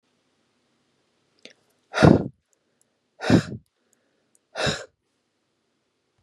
exhalation_length: 6.2 s
exhalation_amplitude: 32720
exhalation_signal_mean_std_ratio: 0.23
survey_phase: beta (2021-08-13 to 2022-03-07)
age: 18-44
gender: Female
wearing_mask: 'No'
symptom_none: true
smoker_status: Ex-smoker
respiratory_condition_asthma: false
respiratory_condition_other: false
recruitment_source: REACT
submission_delay: 2 days
covid_test_result: Negative
covid_test_method: RT-qPCR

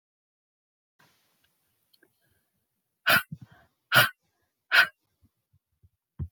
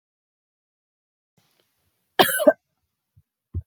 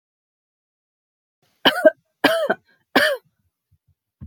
exhalation_length: 6.3 s
exhalation_amplitude: 16150
exhalation_signal_mean_std_ratio: 0.22
cough_length: 3.7 s
cough_amplitude: 27490
cough_signal_mean_std_ratio: 0.2
three_cough_length: 4.3 s
three_cough_amplitude: 28436
three_cough_signal_mean_std_ratio: 0.29
survey_phase: alpha (2021-03-01 to 2021-08-12)
age: 18-44
gender: Female
wearing_mask: 'No'
symptom_none: true
smoker_status: Ex-smoker
respiratory_condition_asthma: false
respiratory_condition_other: false
recruitment_source: REACT
submission_delay: 1 day
covid_test_result: Negative
covid_test_method: RT-qPCR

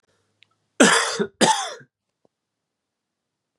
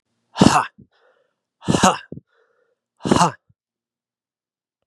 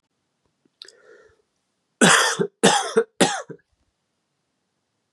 cough_length: 3.6 s
cough_amplitude: 32753
cough_signal_mean_std_ratio: 0.32
exhalation_length: 4.9 s
exhalation_amplitude: 32768
exhalation_signal_mean_std_ratio: 0.28
three_cough_length: 5.1 s
three_cough_amplitude: 28217
three_cough_signal_mean_std_ratio: 0.33
survey_phase: beta (2021-08-13 to 2022-03-07)
age: 18-44
gender: Male
wearing_mask: 'No'
symptom_cough_any: true
symptom_runny_or_blocked_nose: true
symptom_change_to_sense_of_smell_or_taste: true
smoker_status: Never smoked
respiratory_condition_asthma: false
respiratory_condition_other: false
recruitment_source: Test and Trace
submission_delay: 2 days
covid_test_result: Positive
covid_test_method: RT-qPCR
covid_ct_value: 20.0
covid_ct_gene: ORF1ab gene
covid_ct_mean: 23.3
covid_viral_load: 22000 copies/ml
covid_viral_load_category: Low viral load (10K-1M copies/ml)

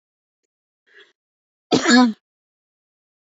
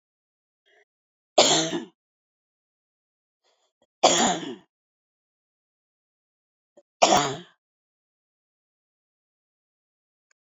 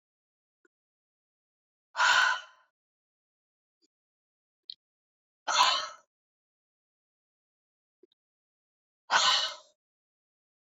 cough_length: 3.3 s
cough_amplitude: 27006
cough_signal_mean_std_ratio: 0.27
three_cough_length: 10.4 s
three_cough_amplitude: 28660
three_cough_signal_mean_std_ratio: 0.24
exhalation_length: 10.7 s
exhalation_amplitude: 11598
exhalation_signal_mean_std_ratio: 0.26
survey_phase: beta (2021-08-13 to 2022-03-07)
age: 45-64
gender: Female
wearing_mask: 'No'
symptom_none: true
smoker_status: Ex-smoker
respiratory_condition_asthma: false
respiratory_condition_other: false
recruitment_source: REACT
submission_delay: 1 day
covid_test_result: Negative
covid_test_method: RT-qPCR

